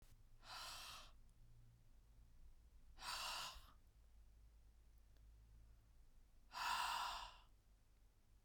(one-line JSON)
{"exhalation_length": "8.4 s", "exhalation_amplitude": 830, "exhalation_signal_mean_std_ratio": 0.56, "survey_phase": "beta (2021-08-13 to 2022-03-07)", "age": "45-64", "gender": "Female", "wearing_mask": "No", "symptom_none": true, "smoker_status": "Never smoked", "respiratory_condition_asthma": false, "respiratory_condition_other": false, "recruitment_source": "REACT", "submission_delay": "2 days", "covid_test_result": "Negative", "covid_test_method": "RT-qPCR", "influenza_a_test_result": "Negative", "influenza_b_test_result": "Negative"}